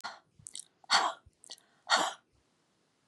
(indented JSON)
{
  "exhalation_length": "3.1 s",
  "exhalation_amplitude": 9813,
  "exhalation_signal_mean_std_ratio": 0.32,
  "survey_phase": "beta (2021-08-13 to 2022-03-07)",
  "age": "45-64",
  "gender": "Female",
  "wearing_mask": "No",
  "symptom_other": true,
  "symptom_onset": "12 days",
  "smoker_status": "Ex-smoker",
  "respiratory_condition_asthma": false,
  "respiratory_condition_other": false,
  "recruitment_source": "REACT",
  "submission_delay": "2 days",
  "covid_test_result": "Negative",
  "covid_test_method": "RT-qPCR",
  "influenza_a_test_result": "Negative",
  "influenza_b_test_result": "Negative"
}